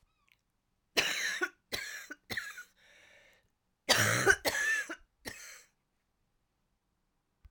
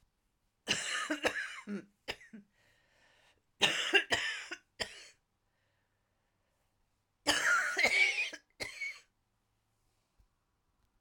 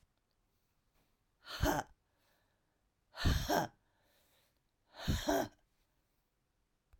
{
  "cough_length": "7.5 s",
  "cough_amplitude": 10409,
  "cough_signal_mean_std_ratio": 0.38,
  "three_cough_length": "11.0 s",
  "three_cough_amplitude": 7995,
  "three_cough_signal_mean_std_ratio": 0.4,
  "exhalation_length": "7.0 s",
  "exhalation_amplitude": 3752,
  "exhalation_signal_mean_std_ratio": 0.33,
  "survey_phase": "alpha (2021-03-01 to 2021-08-12)",
  "age": "45-64",
  "gender": "Female",
  "wearing_mask": "No",
  "symptom_cough_any": true,
  "symptom_new_continuous_cough": true,
  "symptom_shortness_of_breath": true,
  "symptom_fatigue": true,
  "symptom_headache": true,
  "symptom_change_to_sense_of_smell_or_taste": true,
  "symptom_loss_of_taste": true,
  "symptom_onset": "3 days",
  "smoker_status": "Never smoked",
  "respiratory_condition_asthma": true,
  "respiratory_condition_other": true,
  "recruitment_source": "Test and Trace",
  "submission_delay": "1 day",
  "covid_test_result": "Positive",
  "covid_test_method": "RT-qPCR",
  "covid_ct_value": 18.5,
  "covid_ct_gene": "N gene"
}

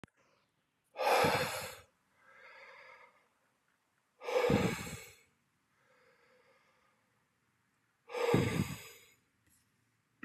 {
  "exhalation_length": "10.2 s",
  "exhalation_amplitude": 6200,
  "exhalation_signal_mean_std_ratio": 0.36,
  "survey_phase": "beta (2021-08-13 to 2022-03-07)",
  "age": "45-64",
  "gender": "Male",
  "wearing_mask": "No",
  "symptom_none": true,
  "smoker_status": "Never smoked",
  "respiratory_condition_asthma": false,
  "respiratory_condition_other": false,
  "recruitment_source": "Test and Trace",
  "submission_delay": "2 days",
  "covid_test_result": "Negative",
  "covid_test_method": "RT-qPCR"
}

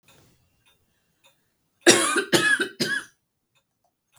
{
  "three_cough_length": "4.2 s",
  "three_cough_amplitude": 32766,
  "three_cough_signal_mean_std_ratio": 0.35,
  "survey_phase": "beta (2021-08-13 to 2022-03-07)",
  "age": "18-44",
  "gender": "Female",
  "wearing_mask": "No",
  "symptom_sore_throat": true,
  "symptom_fatigue": true,
  "symptom_headache": true,
  "symptom_onset": "4 days",
  "smoker_status": "Ex-smoker",
  "respiratory_condition_asthma": true,
  "respiratory_condition_other": false,
  "recruitment_source": "Test and Trace",
  "submission_delay": "2 days",
  "covid_test_result": "Negative",
  "covid_test_method": "RT-qPCR"
}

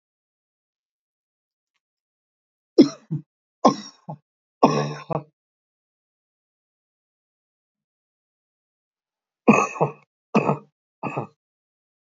{
  "three_cough_length": "12.1 s",
  "three_cough_amplitude": 27590,
  "three_cough_signal_mean_std_ratio": 0.22,
  "survey_phase": "beta (2021-08-13 to 2022-03-07)",
  "age": "65+",
  "gender": "Male",
  "wearing_mask": "No",
  "symptom_none": true,
  "smoker_status": "Never smoked",
  "respiratory_condition_asthma": false,
  "respiratory_condition_other": false,
  "recruitment_source": "REACT",
  "submission_delay": "2 days",
  "covid_test_result": "Negative",
  "covid_test_method": "RT-qPCR",
  "influenza_a_test_result": "Negative",
  "influenza_b_test_result": "Negative"
}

